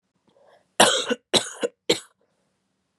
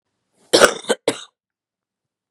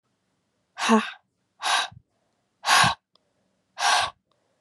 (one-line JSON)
{"three_cough_length": "3.0 s", "three_cough_amplitude": 28705, "three_cough_signal_mean_std_ratio": 0.31, "cough_length": "2.3 s", "cough_amplitude": 32768, "cough_signal_mean_std_ratio": 0.26, "exhalation_length": "4.6 s", "exhalation_amplitude": 18977, "exhalation_signal_mean_std_ratio": 0.38, "survey_phase": "beta (2021-08-13 to 2022-03-07)", "age": "18-44", "gender": "Female", "wearing_mask": "No", "symptom_cough_any": true, "symptom_new_continuous_cough": true, "symptom_runny_or_blocked_nose": true, "symptom_shortness_of_breath": true, "symptom_sore_throat": true, "symptom_abdominal_pain": true, "symptom_diarrhoea": true, "symptom_fatigue": true, "symptom_headache": true, "symptom_onset": "3 days", "smoker_status": "Prefer not to say", "respiratory_condition_asthma": false, "respiratory_condition_other": false, "recruitment_source": "Test and Trace", "submission_delay": "1 day", "covid_test_result": "Positive", "covid_test_method": "RT-qPCR", "covid_ct_value": 17.7, "covid_ct_gene": "ORF1ab gene"}